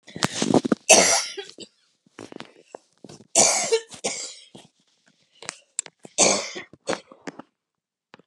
{"three_cough_length": "8.3 s", "three_cough_amplitude": 32768, "three_cough_signal_mean_std_ratio": 0.35, "survey_phase": "beta (2021-08-13 to 2022-03-07)", "age": "65+", "gender": "Female", "wearing_mask": "No", "symptom_cough_any": true, "smoker_status": "Never smoked", "respiratory_condition_asthma": false, "respiratory_condition_other": false, "recruitment_source": "REACT", "submission_delay": "1 day", "covid_test_result": "Negative", "covid_test_method": "RT-qPCR"}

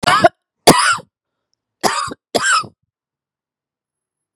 {"three_cough_length": "4.4 s", "three_cough_amplitude": 32768, "three_cough_signal_mean_std_ratio": 0.37, "survey_phase": "beta (2021-08-13 to 2022-03-07)", "age": "45-64", "gender": "Female", "wearing_mask": "No", "symptom_cough_any": true, "symptom_runny_or_blocked_nose": true, "symptom_sore_throat": true, "symptom_fatigue": true, "symptom_onset": "3 days", "smoker_status": "Never smoked", "recruitment_source": "Test and Trace", "submission_delay": "1 day", "covid_test_result": "Positive", "covid_test_method": "RT-qPCR", "covid_ct_value": 23.3, "covid_ct_gene": "N gene"}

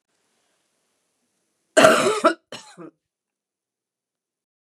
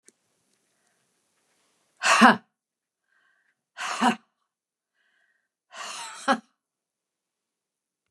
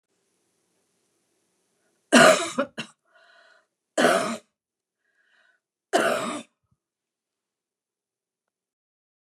{"cough_length": "4.7 s", "cough_amplitude": 29204, "cough_signal_mean_std_ratio": 0.25, "exhalation_length": "8.1 s", "exhalation_amplitude": 29055, "exhalation_signal_mean_std_ratio": 0.22, "three_cough_length": "9.2 s", "three_cough_amplitude": 28854, "three_cough_signal_mean_std_ratio": 0.26, "survey_phase": "beta (2021-08-13 to 2022-03-07)", "age": "65+", "gender": "Female", "wearing_mask": "No", "symptom_cough_any": true, "symptom_runny_or_blocked_nose": true, "symptom_fatigue": true, "symptom_change_to_sense_of_smell_or_taste": true, "symptom_other": true, "symptom_onset": "5 days", "smoker_status": "Never smoked", "respiratory_condition_asthma": false, "respiratory_condition_other": false, "recruitment_source": "Test and Trace", "submission_delay": "-1 day", "covid_test_result": "Positive", "covid_test_method": "RT-qPCR", "covid_ct_value": 19.6, "covid_ct_gene": "ORF1ab gene", "covid_ct_mean": 19.9, "covid_viral_load": "290000 copies/ml", "covid_viral_load_category": "Low viral load (10K-1M copies/ml)"}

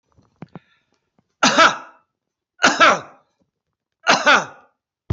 {"three_cough_length": "5.1 s", "three_cough_amplitude": 29787, "three_cough_signal_mean_std_ratio": 0.34, "survey_phase": "beta (2021-08-13 to 2022-03-07)", "age": "65+", "gender": "Male", "wearing_mask": "No", "symptom_none": true, "smoker_status": "Never smoked", "respiratory_condition_asthma": false, "respiratory_condition_other": false, "recruitment_source": "REACT", "submission_delay": "1 day", "covid_test_result": "Negative", "covid_test_method": "RT-qPCR"}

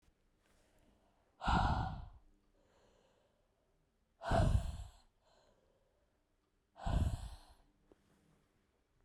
{"exhalation_length": "9.0 s", "exhalation_amplitude": 2875, "exhalation_signal_mean_std_ratio": 0.34, "survey_phase": "beta (2021-08-13 to 2022-03-07)", "age": "18-44", "gender": "Female", "wearing_mask": "No", "symptom_cough_any": true, "symptom_runny_or_blocked_nose": true, "symptom_shortness_of_breath": true, "symptom_sore_throat": true, "symptom_abdominal_pain": true, "symptom_fatigue": true, "symptom_fever_high_temperature": true, "symptom_headache": true, "symptom_change_to_sense_of_smell_or_taste": true, "symptom_loss_of_taste": true, "symptom_other": true, "symptom_onset": "3 days", "smoker_status": "Never smoked", "respiratory_condition_asthma": false, "respiratory_condition_other": false, "recruitment_source": "Test and Trace", "submission_delay": "2 days", "covid_test_result": "Positive", "covid_test_method": "RT-qPCR", "covid_ct_value": 15.1, "covid_ct_gene": "ORF1ab gene", "covid_ct_mean": 15.3, "covid_viral_load": "9800000 copies/ml", "covid_viral_load_category": "High viral load (>1M copies/ml)"}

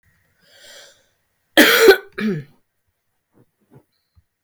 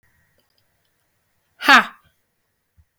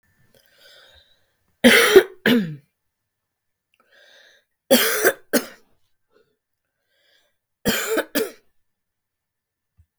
{"cough_length": "4.4 s", "cough_amplitude": 32768, "cough_signal_mean_std_ratio": 0.28, "exhalation_length": "3.0 s", "exhalation_amplitude": 32768, "exhalation_signal_mean_std_ratio": 0.19, "three_cough_length": "10.0 s", "three_cough_amplitude": 32768, "three_cough_signal_mean_std_ratio": 0.29, "survey_phase": "beta (2021-08-13 to 2022-03-07)", "age": "45-64", "gender": "Female", "wearing_mask": "No", "symptom_cough_any": true, "symptom_abdominal_pain": true, "symptom_fatigue": true, "symptom_change_to_sense_of_smell_or_taste": true, "smoker_status": "Never smoked", "respiratory_condition_asthma": false, "respiratory_condition_other": false, "recruitment_source": "REACT", "submission_delay": "3 days", "covid_test_result": "Negative", "covid_test_method": "RT-qPCR", "influenza_a_test_result": "Negative", "influenza_b_test_result": "Negative"}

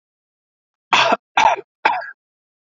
{"three_cough_length": "2.6 s", "three_cough_amplitude": 29312, "three_cough_signal_mean_std_ratio": 0.38, "survey_phase": "alpha (2021-03-01 to 2021-08-12)", "age": "18-44", "gender": "Male", "wearing_mask": "No", "symptom_abdominal_pain": true, "symptom_fatigue": true, "symptom_fever_high_temperature": true, "symptom_headache": true, "smoker_status": "Never smoked", "respiratory_condition_asthma": false, "respiratory_condition_other": false, "recruitment_source": "Test and Trace", "submission_delay": "2 days", "covid_test_result": "Positive", "covid_test_method": "RT-qPCR", "covid_ct_value": 15.5, "covid_ct_gene": "ORF1ab gene", "covid_ct_mean": 16.2, "covid_viral_load": "5000000 copies/ml", "covid_viral_load_category": "High viral load (>1M copies/ml)"}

